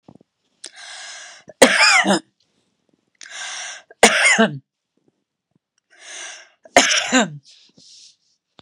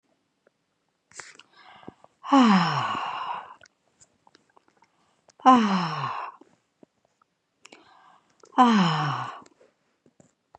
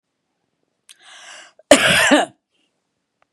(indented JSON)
{
  "three_cough_length": "8.6 s",
  "three_cough_amplitude": 32768,
  "three_cough_signal_mean_std_ratio": 0.36,
  "exhalation_length": "10.6 s",
  "exhalation_amplitude": 20889,
  "exhalation_signal_mean_std_ratio": 0.36,
  "cough_length": "3.3 s",
  "cough_amplitude": 32768,
  "cough_signal_mean_std_ratio": 0.31,
  "survey_phase": "beta (2021-08-13 to 2022-03-07)",
  "age": "65+",
  "gender": "Female",
  "wearing_mask": "No",
  "symptom_cough_any": true,
  "smoker_status": "Never smoked",
  "respiratory_condition_asthma": false,
  "respiratory_condition_other": false,
  "recruitment_source": "REACT",
  "submission_delay": "1 day",
  "covid_test_result": "Negative",
  "covid_test_method": "RT-qPCR",
  "influenza_a_test_result": "Negative",
  "influenza_b_test_result": "Negative"
}